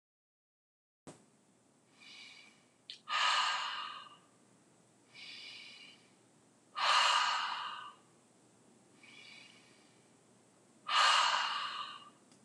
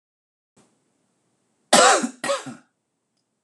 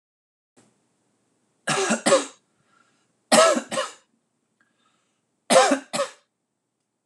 exhalation_length: 12.4 s
exhalation_amplitude: 5381
exhalation_signal_mean_std_ratio: 0.41
cough_length: 3.4 s
cough_amplitude: 26028
cough_signal_mean_std_ratio: 0.29
three_cough_length: 7.1 s
three_cough_amplitude: 24721
three_cough_signal_mean_std_ratio: 0.33
survey_phase: alpha (2021-03-01 to 2021-08-12)
age: 45-64
gender: Male
wearing_mask: 'No'
symptom_none: true
smoker_status: Ex-smoker
respiratory_condition_asthma: false
respiratory_condition_other: false
recruitment_source: REACT
submission_delay: 9 days
covid_test_result: Negative
covid_test_method: RT-qPCR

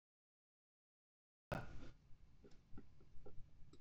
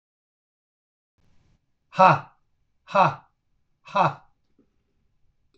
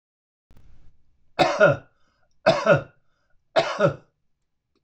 cough_length: 3.8 s
cough_amplitude: 785
cough_signal_mean_std_ratio: 0.54
exhalation_length: 5.6 s
exhalation_amplitude: 26009
exhalation_signal_mean_std_ratio: 0.24
three_cough_length: 4.8 s
three_cough_amplitude: 23331
three_cough_signal_mean_std_ratio: 0.35
survey_phase: beta (2021-08-13 to 2022-03-07)
age: 65+
gender: Male
wearing_mask: 'No'
symptom_none: true
smoker_status: Ex-smoker
respiratory_condition_asthma: false
respiratory_condition_other: false
recruitment_source: REACT
submission_delay: 0 days
covid_test_result: Negative
covid_test_method: RT-qPCR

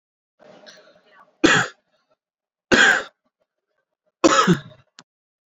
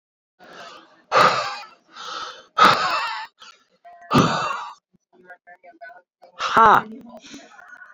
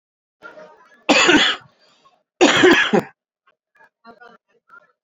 three_cough_length: 5.5 s
three_cough_amplitude: 27623
three_cough_signal_mean_std_ratio: 0.32
exhalation_length: 7.9 s
exhalation_amplitude: 27681
exhalation_signal_mean_std_ratio: 0.39
cough_length: 5.0 s
cough_amplitude: 30103
cough_signal_mean_std_ratio: 0.38
survey_phase: alpha (2021-03-01 to 2021-08-12)
age: 18-44
gender: Male
wearing_mask: 'No'
symptom_cough_any: true
symptom_diarrhoea: true
symptom_change_to_sense_of_smell_or_taste: true
symptom_onset: 2 days
smoker_status: Current smoker (11 or more cigarettes per day)
respiratory_condition_asthma: false
respiratory_condition_other: false
recruitment_source: Test and Trace
submission_delay: 2 days
covid_test_result: Positive
covid_test_method: RT-qPCR
covid_ct_value: 14.9
covid_ct_gene: ORF1ab gene
covid_ct_mean: 16.3
covid_viral_load: 4700000 copies/ml
covid_viral_load_category: High viral load (>1M copies/ml)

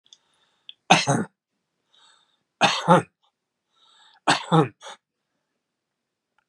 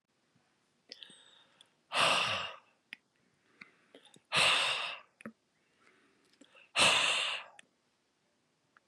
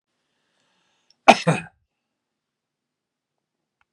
three_cough_length: 6.5 s
three_cough_amplitude: 32001
three_cough_signal_mean_std_ratio: 0.28
exhalation_length: 8.9 s
exhalation_amplitude: 6715
exhalation_signal_mean_std_ratio: 0.37
cough_length: 3.9 s
cough_amplitude: 32768
cough_signal_mean_std_ratio: 0.15
survey_phase: beta (2021-08-13 to 2022-03-07)
age: 65+
gender: Male
wearing_mask: 'No'
symptom_none: true
smoker_status: Never smoked
respiratory_condition_asthma: false
respiratory_condition_other: false
recruitment_source: REACT
submission_delay: 3 days
covid_test_result: Negative
covid_test_method: RT-qPCR
influenza_a_test_result: Negative
influenza_b_test_result: Negative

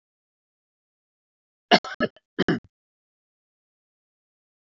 cough_length: 4.6 s
cough_amplitude: 23288
cough_signal_mean_std_ratio: 0.18
survey_phase: alpha (2021-03-01 to 2021-08-12)
age: 45-64
gender: Male
wearing_mask: 'No'
symptom_cough_any: true
symptom_change_to_sense_of_smell_or_taste: true
symptom_loss_of_taste: true
smoker_status: Never smoked
respiratory_condition_asthma: false
respiratory_condition_other: false
recruitment_source: Test and Trace
submission_delay: 2 days
covid_test_result: Positive
covid_test_method: RT-qPCR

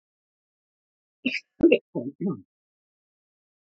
cough_length: 3.8 s
cough_amplitude: 18138
cough_signal_mean_std_ratio: 0.25
survey_phase: beta (2021-08-13 to 2022-03-07)
age: 45-64
gender: Male
wearing_mask: 'No'
symptom_cough_any: true
symptom_abdominal_pain: true
symptom_diarrhoea: true
symptom_fatigue: true
symptom_fever_high_temperature: true
symptom_headache: true
symptom_change_to_sense_of_smell_or_taste: true
symptom_loss_of_taste: true
symptom_onset: 4 days
smoker_status: Never smoked
respiratory_condition_asthma: true
respiratory_condition_other: false
recruitment_source: Test and Trace
submission_delay: 2 days
covid_test_result: Positive
covid_test_method: RT-qPCR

